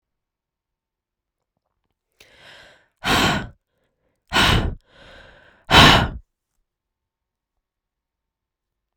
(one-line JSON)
{"exhalation_length": "9.0 s", "exhalation_amplitude": 32768, "exhalation_signal_mean_std_ratio": 0.27, "survey_phase": "beta (2021-08-13 to 2022-03-07)", "age": "18-44", "gender": "Female", "wearing_mask": "No", "symptom_cough_any": true, "symptom_runny_or_blocked_nose": true, "symptom_sore_throat": true, "symptom_fatigue": true, "symptom_headache": true, "symptom_change_to_sense_of_smell_or_taste": true, "symptom_loss_of_taste": true, "symptom_onset": "4 days", "smoker_status": "Ex-smoker", "respiratory_condition_asthma": true, "respiratory_condition_other": false, "recruitment_source": "Test and Trace", "submission_delay": "1 day", "covid_test_result": "Positive", "covid_test_method": "RT-qPCR", "covid_ct_value": 14.9, "covid_ct_gene": "ORF1ab gene", "covid_ct_mean": 15.3, "covid_viral_load": "9300000 copies/ml", "covid_viral_load_category": "High viral load (>1M copies/ml)"}